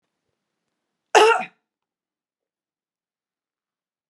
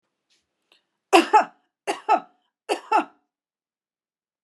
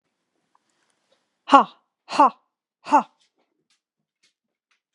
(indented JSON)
{
  "cough_length": "4.1 s",
  "cough_amplitude": 32037,
  "cough_signal_mean_std_ratio": 0.2,
  "three_cough_length": "4.4 s",
  "three_cough_amplitude": 32765,
  "three_cough_signal_mean_std_ratio": 0.28,
  "exhalation_length": "4.9 s",
  "exhalation_amplitude": 32767,
  "exhalation_signal_mean_std_ratio": 0.2,
  "survey_phase": "beta (2021-08-13 to 2022-03-07)",
  "age": "45-64",
  "gender": "Female",
  "wearing_mask": "No",
  "symptom_none": true,
  "smoker_status": "Ex-smoker",
  "respiratory_condition_asthma": false,
  "respiratory_condition_other": false,
  "recruitment_source": "REACT",
  "submission_delay": "1 day",
  "covid_test_result": "Negative",
  "covid_test_method": "RT-qPCR"
}